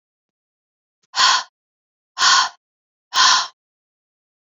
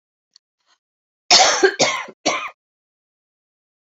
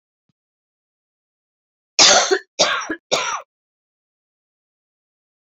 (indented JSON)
{
  "exhalation_length": "4.4 s",
  "exhalation_amplitude": 31153,
  "exhalation_signal_mean_std_ratio": 0.36,
  "cough_length": "3.8 s",
  "cough_amplitude": 32768,
  "cough_signal_mean_std_ratio": 0.34,
  "three_cough_length": "5.5 s",
  "three_cough_amplitude": 32342,
  "three_cough_signal_mean_std_ratio": 0.3,
  "survey_phase": "beta (2021-08-13 to 2022-03-07)",
  "age": "45-64",
  "gender": "Female",
  "wearing_mask": "No",
  "symptom_cough_any": true,
  "symptom_new_continuous_cough": true,
  "symptom_runny_or_blocked_nose": true,
  "symptom_abdominal_pain": true,
  "symptom_fatigue": true,
  "symptom_headache": true,
  "symptom_change_to_sense_of_smell_or_taste": true,
  "symptom_loss_of_taste": true,
  "symptom_other": true,
  "symptom_onset": "5 days",
  "smoker_status": "Never smoked",
  "respiratory_condition_asthma": false,
  "respiratory_condition_other": false,
  "recruitment_source": "Test and Trace",
  "submission_delay": "2 days",
  "covid_test_result": "Positive",
  "covid_test_method": "RT-qPCR",
  "covid_ct_value": 17.9,
  "covid_ct_gene": "N gene",
  "covid_ct_mean": 18.2,
  "covid_viral_load": "1100000 copies/ml",
  "covid_viral_load_category": "High viral load (>1M copies/ml)"
}